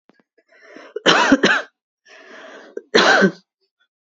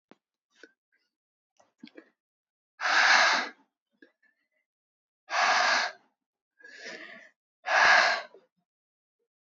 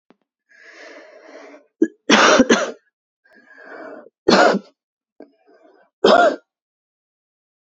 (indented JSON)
{
  "cough_length": "4.2 s",
  "cough_amplitude": 32767,
  "cough_signal_mean_std_ratio": 0.39,
  "exhalation_length": "9.5 s",
  "exhalation_amplitude": 13095,
  "exhalation_signal_mean_std_ratio": 0.36,
  "three_cough_length": "7.7 s",
  "three_cough_amplitude": 32768,
  "three_cough_signal_mean_std_ratio": 0.33,
  "survey_phase": "beta (2021-08-13 to 2022-03-07)",
  "age": "18-44",
  "gender": "Female",
  "wearing_mask": "Yes",
  "symptom_cough_any": true,
  "symptom_runny_or_blocked_nose": true,
  "symptom_shortness_of_breath": true,
  "symptom_sore_throat": true,
  "symptom_fatigue": true,
  "smoker_status": "Current smoker (1 to 10 cigarettes per day)",
  "respiratory_condition_asthma": false,
  "respiratory_condition_other": false,
  "recruitment_source": "Test and Trace",
  "submission_delay": "2 days",
  "covid_test_result": "Positive",
  "covid_test_method": "RT-qPCR",
  "covid_ct_value": 23.2,
  "covid_ct_gene": "ORF1ab gene",
  "covid_ct_mean": 23.5,
  "covid_viral_load": "19000 copies/ml",
  "covid_viral_load_category": "Low viral load (10K-1M copies/ml)"
}